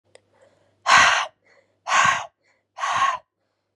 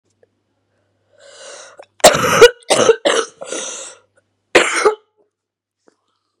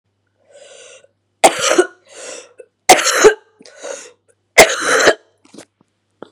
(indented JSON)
{
  "exhalation_length": "3.8 s",
  "exhalation_amplitude": 27417,
  "exhalation_signal_mean_std_ratio": 0.43,
  "cough_length": "6.4 s",
  "cough_amplitude": 32768,
  "cough_signal_mean_std_ratio": 0.34,
  "three_cough_length": "6.3 s",
  "three_cough_amplitude": 32768,
  "three_cough_signal_mean_std_ratio": 0.35,
  "survey_phase": "beta (2021-08-13 to 2022-03-07)",
  "age": "18-44",
  "gender": "Female",
  "wearing_mask": "No",
  "symptom_cough_any": true,
  "symptom_runny_or_blocked_nose": true,
  "symptom_onset": "6 days",
  "smoker_status": "Never smoked",
  "respiratory_condition_asthma": false,
  "respiratory_condition_other": false,
  "recruitment_source": "Test and Trace",
  "submission_delay": "2 days",
  "covid_test_result": "Positive",
  "covid_test_method": "ePCR"
}